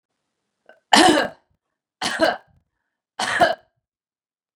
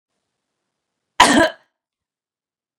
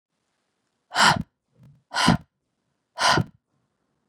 {"three_cough_length": "4.6 s", "three_cough_amplitude": 32767, "three_cough_signal_mean_std_ratio": 0.33, "cough_length": "2.8 s", "cough_amplitude": 32768, "cough_signal_mean_std_ratio": 0.24, "exhalation_length": "4.1 s", "exhalation_amplitude": 22243, "exhalation_signal_mean_std_ratio": 0.32, "survey_phase": "beta (2021-08-13 to 2022-03-07)", "age": "18-44", "gender": "Female", "wearing_mask": "No", "symptom_none": true, "smoker_status": "Never smoked", "respiratory_condition_asthma": false, "respiratory_condition_other": false, "recruitment_source": "Test and Trace", "submission_delay": "3 days", "covid_test_result": "Negative", "covid_test_method": "RT-qPCR"}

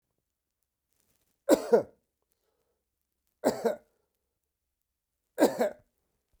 {"three_cough_length": "6.4 s", "three_cough_amplitude": 13702, "three_cough_signal_mean_std_ratio": 0.25, "survey_phase": "beta (2021-08-13 to 2022-03-07)", "age": "65+", "gender": "Male", "wearing_mask": "No", "symptom_cough_any": true, "symptom_runny_or_blocked_nose": true, "symptom_sore_throat": true, "smoker_status": "Ex-smoker", "respiratory_condition_asthma": false, "respiratory_condition_other": false, "recruitment_source": "REACT", "submission_delay": "1 day", "covid_test_result": "Negative", "covid_test_method": "RT-qPCR"}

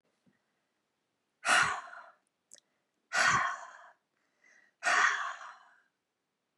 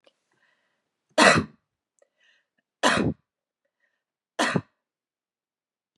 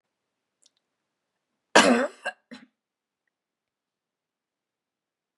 {"exhalation_length": "6.6 s", "exhalation_amplitude": 6924, "exhalation_signal_mean_std_ratio": 0.36, "three_cough_length": "6.0 s", "three_cough_amplitude": 26772, "three_cough_signal_mean_std_ratio": 0.26, "cough_length": "5.4 s", "cough_amplitude": 27647, "cough_signal_mean_std_ratio": 0.19, "survey_phase": "beta (2021-08-13 to 2022-03-07)", "age": "65+", "gender": "Female", "wearing_mask": "No", "symptom_none": true, "smoker_status": "Never smoked", "respiratory_condition_asthma": false, "respiratory_condition_other": false, "recruitment_source": "Test and Trace", "submission_delay": "0 days", "covid_test_result": "Negative", "covid_test_method": "LFT"}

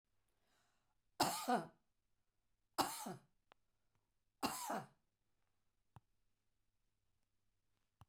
{"three_cough_length": "8.1 s", "three_cough_amplitude": 2837, "three_cough_signal_mean_std_ratio": 0.28, "survey_phase": "beta (2021-08-13 to 2022-03-07)", "age": "65+", "gender": "Female", "wearing_mask": "No", "symptom_none": true, "smoker_status": "Ex-smoker", "respiratory_condition_asthma": true, "respiratory_condition_other": false, "recruitment_source": "REACT", "submission_delay": "1 day", "covid_test_result": "Negative", "covid_test_method": "RT-qPCR", "influenza_a_test_result": "Negative", "influenza_b_test_result": "Negative"}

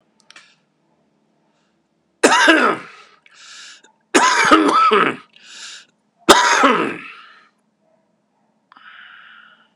{"three_cough_length": "9.8 s", "three_cough_amplitude": 32768, "three_cough_signal_mean_std_ratio": 0.4, "survey_phase": "beta (2021-08-13 to 2022-03-07)", "age": "65+", "gender": "Male", "wearing_mask": "No", "symptom_cough_any": true, "symptom_runny_or_blocked_nose": true, "symptom_fatigue": true, "symptom_headache": true, "symptom_onset": "3 days", "smoker_status": "Ex-smoker", "respiratory_condition_asthma": false, "respiratory_condition_other": false, "recruitment_source": "Test and Trace", "submission_delay": "2 days", "covid_test_result": "Positive", "covid_test_method": "RT-qPCR", "covid_ct_value": 12.1, "covid_ct_gene": "ORF1ab gene", "covid_ct_mean": 12.6, "covid_viral_load": "75000000 copies/ml", "covid_viral_load_category": "High viral load (>1M copies/ml)"}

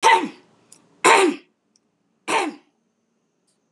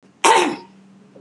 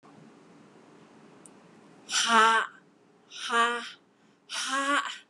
{"three_cough_length": "3.7 s", "three_cough_amplitude": 31577, "three_cough_signal_mean_std_ratio": 0.36, "cough_length": "1.2 s", "cough_amplitude": 31019, "cough_signal_mean_std_ratio": 0.43, "exhalation_length": "5.3 s", "exhalation_amplitude": 13596, "exhalation_signal_mean_std_ratio": 0.43, "survey_phase": "beta (2021-08-13 to 2022-03-07)", "age": "65+", "gender": "Female", "wearing_mask": "No", "symptom_none": true, "smoker_status": "Never smoked", "respiratory_condition_asthma": false, "respiratory_condition_other": false, "recruitment_source": "REACT", "submission_delay": "3 days", "covid_test_result": "Negative", "covid_test_method": "RT-qPCR"}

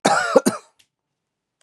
{"cough_length": "1.6 s", "cough_amplitude": 32550, "cough_signal_mean_std_ratio": 0.37, "survey_phase": "beta (2021-08-13 to 2022-03-07)", "age": "45-64", "gender": "Male", "wearing_mask": "No", "symptom_cough_any": true, "symptom_runny_or_blocked_nose": true, "smoker_status": "Never smoked", "respiratory_condition_asthma": false, "respiratory_condition_other": false, "recruitment_source": "REACT", "submission_delay": "14 days", "covid_test_result": "Negative", "covid_test_method": "RT-qPCR", "influenza_a_test_result": "Negative", "influenza_b_test_result": "Negative"}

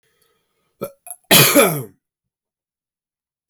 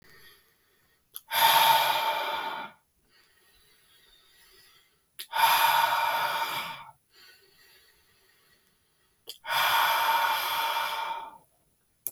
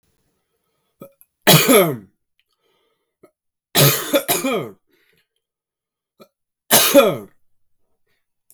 {"cough_length": "3.5 s", "cough_amplitude": 32768, "cough_signal_mean_std_ratio": 0.3, "exhalation_length": "12.1 s", "exhalation_amplitude": 12468, "exhalation_signal_mean_std_ratio": 0.51, "three_cough_length": "8.5 s", "three_cough_amplitude": 32768, "three_cough_signal_mean_std_ratio": 0.33, "survey_phase": "beta (2021-08-13 to 2022-03-07)", "age": "18-44", "gender": "Male", "wearing_mask": "No", "symptom_cough_any": true, "symptom_runny_or_blocked_nose": true, "symptom_fatigue": true, "symptom_fever_high_temperature": true, "symptom_headache": true, "smoker_status": "Never smoked", "respiratory_condition_asthma": false, "respiratory_condition_other": false, "recruitment_source": "Test and Trace", "submission_delay": "2 days", "covid_test_result": "Positive", "covid_test_method": "RT-qPCR", "covid_ct_value": 16.2, "covid_ct_gene": "ORF1ab gene"}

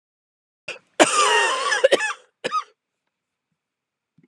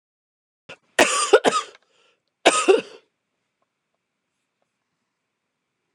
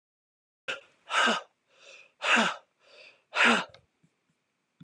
{"cough_length": "4.3 s", "cough_amplitude": 31563, "cough_signal_mean_std_ratio": 0.4, "three_cough_length": "5.9 s", "three_cough_amplitude": 32119, "three_cough_signal_mean_std_ratio": 0.27, "exhalation_length": "4.8 s", "exhalation_amplitude": 11107, "exhalation_signal_mean_std_ratio": 0.36, "survey_phase": "beta (2021-08-13 to 2022-03-07)", "age": "45-64", "gender": "Female", "wearing_mask": "No", "symptom_cough_any": true, "symptom_sore_throat": true, "symptom_fatigue": true, "symptom_other": true, "symptom_onset": "15 days", "smoker_status": "Never smoked", "respiratory_condition_asthma": true, "respiratory_condition_other": false, "recruitment_source": "Test and Trace", "submission_delay": "13 days", "covid_test_result": "Negative", "covid_test_method": "RT-qPCR"}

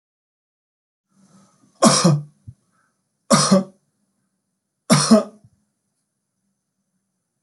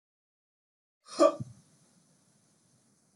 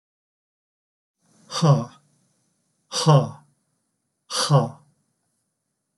{"three_cough_length": "7.4 s", "three_cough_amplitude": 32393, "three_cough_signal_mean_std_ratio": 0.29, "cough_length": "3.2 s", "cough_amplitude": 10672, "cough_signal_mean_std_ratio": 0.19, "exhalation_length": "6.0 s", "exhalation_amplitude": 22735, "exhalation_signal_mean_std_ratio": 0.3, "survey_phase": "beta (2021-08-13 to 2022-03-07)", "age": "65+", "gender": "Male", "wearing_mask": "No", "symptom_none": true, "smoker_status": "Never smoked", "respiratory_condition_asthma": false, "respiratory_condition_other": false, "recruitment_source": "REACT", "submission_delay": "1 day", "covid_test_result": "Negative", "covid_test_method": "RT-qPCR"}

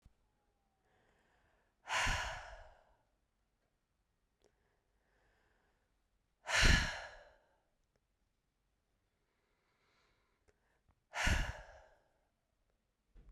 {"exhalation_length": "13.3 s", "exhalation_amplitude": 5806, "exhalation_signal_mean_std_ratio": 0.25, "survey_phase": "beta (2021-08-13 to 2022-03-07)", "age": "18-44", "gender": "Female", "wearing_mask": "No", "symptom_none": true, "smoker_status": "Never smoked", "respiratory_condition_asthma": false, "respiratory_condition_other": false, "recruitment_source": "REACT", "submission_delay": "1 day", "covid_test_result": "Negative", "covid_test_method": "RT-qPCR"}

